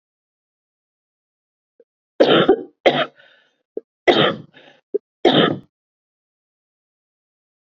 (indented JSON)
{
  "three_cough_length": "7.8 s",
  "three_cough_amplitude": 28591,
  "three_cough_signal_mean_std_ratio": 0.3,
  "survey_phase": "beta (2021-08-13 to 2022-03-07)",
  "age": "45-64",
  "gender": "Female",
  "wearing_mask": "No",
  "symptom_cough_any": true,
  "symptom_runny_or_blocked_nose": true,
  "symptom_shortness_of_breath": true,
  "symptom_diarrhoea": true,
  "symptom_fatigue": true,
  "symptom_headache": true,
  "symptom_change_to_sense_of_smell_or_taste": true,
  "symptom_loss_of_taste": true,
  "symptom_onset": "3 days",
  "smoker_status": "Never smoked",
  "respiratory_condition_asthma": false,
  "respiratory_condition_other": false,
  "recruitment_source": "Test and Trace",
  "submission_delay": "2 days",
  "covid_test_result": "Positive",
  "covid_test_method": "RT-qPCR"
}